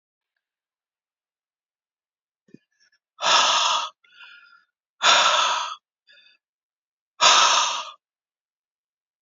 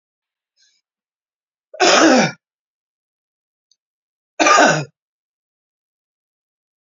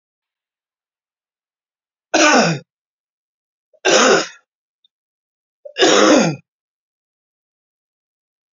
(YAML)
exhalation_length: 9.2 s
exhalation_amplitude: 27496
exhalation_signal_mean_std_ratio: 0.37
cough_length: 6.8 s
cough_amplitude: 32264
cough_signal_mean_std_ratio: 0.3
three_cough_length: 8.5 s
three_cough_amplitude: 29993
three_cough_signal_mean_std_ratio: 0.33
survey_phase: alpha (2021-03-01 to 2021-08-12)
age: 45-64
gender: Male
wearing_mask: 'No'
symptom_cough_any: true
symptom_onset: 5 days
smoker_status: Never smoked
respiratory_condition_asthma: false
respiratory_condition_other: false
recruitment_source: Test and Trace
submission_delay: 1 day
covid_test_result: Positive
covid_test_method: RT-qPCR